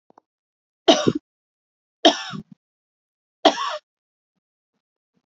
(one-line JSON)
{"three_cough_length": "5.3 s", "three_cough_amplitude": 28902, "three_cough_signal_mean_std_ratio": 0.24, "survey_phase": "beta (2021-08-13 to 2022-03-07)", "age": "45-64", "gender": "Female", "wearing_mask": "No", "symptom_cough_any": true, "symptom_runny_or_blocked_nose": true, "symptom_fatigue": true, "symptom_headache": true, "symptom_change_to_sense_of_smell_or_taste": true, "symptom_onset": "3 days", "smoker_status": "Never smoked", "respiratory_condition_asthma": false, "respiratory_condition_other": false, "recruitment_source": "Test and Trace", "submission_delay": "2 days", "covid_test_result": "Positive", "covid_test_method": "RT-qPCR", "covid_ct_value": 17.1, "covid_ct_gene": "ORF1ab gene", "covid_ct_mean": 17.5, "covid_viral_load": "1800000 copies/ml", "covid_viral_load_category": "High viral load (>1M copies/ml)"}